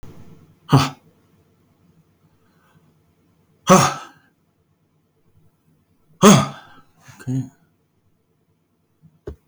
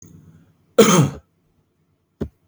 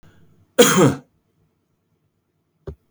{
  "exhalation_length": "9.5 s",
  "exhalation_amplitude": 32767,
  "exhalation_signal_mean_std_ratio": 0.23,
  "cough_length": "2.5 s",
  "cough_amplitude": 32021,
  "cough_signal_mean_std_ratio": 0.31,
  "three_cough_length": "2.9 s",
  "three_cough_amplitude": 32767,
  "three_cough_signal_mean_std_ratio": 0.28,
  "survey_phase": "beta (2021-08-13 to 2022-03-07)",
  "age": "65+",
  "gender": "Male",
  "wearing_mask": "No",
  "symptom_cough_any": true,
  "smoker_status": "Never smoked",
  "respiratory_condition_asthma": false,
  "respiratory_condition_other": false,
  "recruitment_source": "REACT",
  "submission_delay": "2 days",
  "covid_test_result": "Negative",
  "covid_test_method": "RT-qPCR"
}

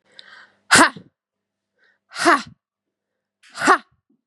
{
  "exhalation_length": "4.3 s",
  "exhalation_amplitude": 32767,
  "exhalation_signal_mean_std_ratio": 0.28,
  "survey_phase": "beta (2021-08-13 to 2022-03-07)",
  "age": "18-44",
  "gender": "Female",
  "wearing_mask": "No",
  "symptom_cough_any": true,
  "symptom_runny_or_blocked_nose": true,
  "symptom_headache": true,
  "symptom_onset": "5 days",
  "smoker_status": "Never smoked",
  "respiratory_condition_asthma": false,
  "respiratory_condition_other": false,
  "recruitment_source": "Test and Trace",
  "submission_delay": "2 days",
  "covid_test_result": "Positive",
  "covid_test_method": "RT-qPCR",
  "covid_ct_value": 25.2,
  "covid_ct_gene": "N gene"
}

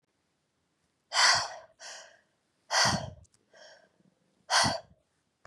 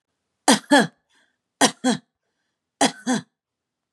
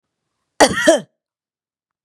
{
  "exhalation_length": "5.5 s",
  "exhalation_amplitude": 10286,
  "exhalation_signal_mean_std_ratio": 0.35,
  "three_cough_length": "3.9 s",
  "three_cough_amplitude": 29478,
  "three_cough_signal_mean_std_ratio": 0.32,
  "cough_length": "2.0 s",
  "cough_amplitude": 32768,
  "cough_signal_mean_std_ratio": 0.3,
  "survey_phase": "beta (2021-08-13 to 2022-03-07)",
  "age": "45-64",
  "gender": "Female",
  "wearing_mask": "No",
  "symptom_none": true,
  "smoker_status": "Ex-smoker",
  "respiratory_condition_asthma": false,
  "respiratory_condition_other": false,
  "recruitment_source": "REACT",
  "submission_delay": "1 day",
  "covid_test_result": "Negative",
  "covid_test_method": "RT-qPCR",
  "influenza_a_test_result": "Negative",
  "influenza_b_test_result": "Negative"
}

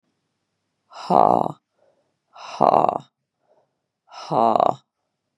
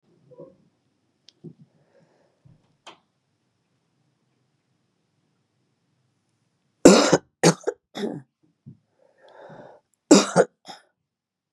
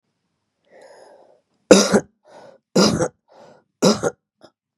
{
  "exhalation_length": "5.4 s",
  "exhalation_amplitude": 31910,
  "exhalation_signal_mean_std_ratio": 0.29,
  "cough_length": "11.5 s",
  "cough_amplitude": 32768,
  "cough_signal_mean_std_ratio": 0.2,
  "three_cough_length": "4.8 s",
  "three_cough_amplitude": 32768,
  "three_cough_signal_mean_std_ratio": 0.31,
  "survey_phase": "beta (2021-08-13 to 2022-03-07)",
  "age": "45-64",
  "gender": "Female",
  "wearing_mask": "No",
  "symptom_cough_any": true,
  "symptom_sore_throat": true,
  "smoker_status": "Never smoked",
  "respiratory_condition_asthma": false,
  "respiratory_condition_other": false,
  "recruitment_source": "Test and Trace",
  "submission_delay": "1 day",
  "covid_test_result": "Positive",
  "covid_test_method": "LFT"
}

